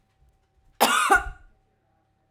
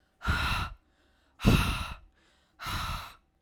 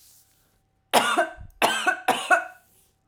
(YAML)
cough_length: 2.3 s
cough_amplitude: 22221
cough_signal_mean_std_ratio: 0.35
exhalation_length: 3.4 s
exhalation_amplitude: 12786
exhalation_signal_mean_std_ratio: 0.48
three_cough_length: 3.1 s
three_cough_amplitude: 23888
three_cough_signal_mean_std_ratio: 0.45
survey_phase: beta (2021-08-13 to 2022-03-07)
age: 18-44
gender: Female
wearing_mask: 'No'
symptom_none: true
smoker_status: Never smoked
respiratory_condition_asthma: false
respiratory_condition_other: false
recruitment_source: REACT
submission_delay: 1 day
covid_test_result: Negative
covid_test_method: RT-qPCR